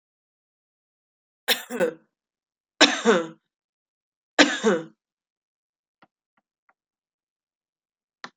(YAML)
three_cough_length: 8.4 s
three_cough_amplitude: 32768
three_cough_signal_mean_std_ratio: 0.25
survey_phase: beta (2021-08-13 to 2022-03-07)
age: 45-64
gender: Female
wearing_mask: 'No'
symptom_cough_any: true
symptom_fatigue: true
symptom_change_to_sense_of_smell_or_taste: true
symptom_onset: 10 days
smoker_status: Ex-smoker
respiratory_condition_asthma: false
respiratory_condition_other: false
recruitment_source: Test and Trace
submission_delay: 2 days
covid_test_result: Positive
covid_test_method: RT-qPCR
covid_ct_value: 29.8
covid_ct_gene: ORF1ab gene